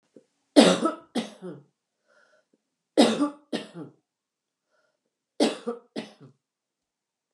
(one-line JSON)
{"three_cough_length": "7.3 s", "three_cough_amplitude": 27188, "three_cough_signal_mean_std_ratio": 0.28, "survey_phase": "alpha (2021-03-01 to 2021-08-12)", "age": "45-64", "gender": "Female", "wearing_mask": "No", "symptom_none": true, "smoker_status": "Never smoked", "respiratory_condition_asthma": false, "respiratory_condition_other": false, "recruitment_source": "REACT", "submission_delay": "3 days", "covid_test_result": "Negative", "covid_test_method": "RT-qPCR"}